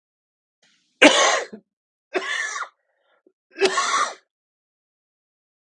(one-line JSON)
{"three_cough_length": "5.6 s", "three_cough_amplitude": 32768, "three_cough_signal_mean_std_ratio": 0.34, "survey_phase": "beta (2021-08-13 to 2022-03-07)", "age": "45-64", "gender": "Male", "wearing_mask": "No", "symptom_cough_any": true, "symptom_sore_throat": true, "symptom_fatigue": true, "symptom_change_to_sense_of_smell_or_taste": true, "symptom_onset": "7 days", "smoker_status": "Ex-smoker", "respiratory_condition_asthma": false, "respiratory_condition_other": false, "recruitment_source": "Test and Trace", "submission_delay": "1 day", "covid_test_result": "Positive", "covid_test_method": "RT-qPCR", "covid_ct_value": 17.0, "covid_ct_gene": "N gene"}